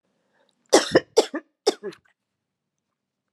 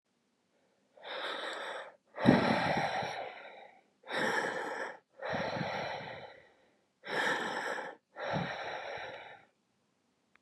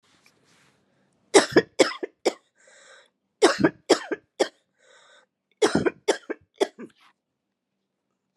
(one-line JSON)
{"cough_length": "3.3 s", "cough_amplitude": 24810, "cough_signal_mean_std_ratio": 0.24, "exhalation_length": "10.4 s", "exhalation_amplitude": 11843, "exhalation_signal_mean_std_ratio": 0.56, "three_cough_length": "8.4 s", "three_cough_amplitude": 28036, "three_cough_signal_mean_std_ratio": 0.27, "survey_phase": "beta (2021-08-13 to 2022-03-07)", "age": "45-64", "gender": "Female", "wearing_mask": "Yes", "symptom_none": true, "symptom_onset": "541 days", "smoker_status": "Never smoked", "respiratory_condition_asthma": false, "respiratory_condition_other": false, "recruitment_source": "Test and Trace", "submission_delay": "539 days", "covid_test_result": "Negative"}